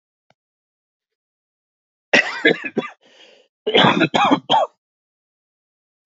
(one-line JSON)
{"cough_length": "6.1 s", "cough_amplitude": 29532, "cough_signal_mean_std_ratio": 0.35, "survey_phase": "alpha (2021-03-01 to 2021-08-12)", "age": "45-64", "gender": "Male", "wearing_mask": "Yes", "symptom_cough_any": true, "symptom_fatigue": true, "symptom_fever_high_temperature": true, "symptom_headache": true, "symptom_change_to_sense_of_smell_or_taste": true, "symptom_onset": "4 days", "smoker_status": "Current smoker (e-cigarettes or vapes only)", "respiratory_condition_asthma": false, "respiratory_condition_other": false, "recruitment_source": "Test and Trace", "submission_delay": "2 days", "covid_test_result": "Positive", "covid_test_method": "RT-qPCR", "covid_ct_value": 17.2, "covid_ct_gene": "ORF1ab gene", "covid_ct_mean": 17.2, "covid_viral_load": "2400000 copies/ml", "covid_viral_load_category": "High viral load (>1M copies/ml)"}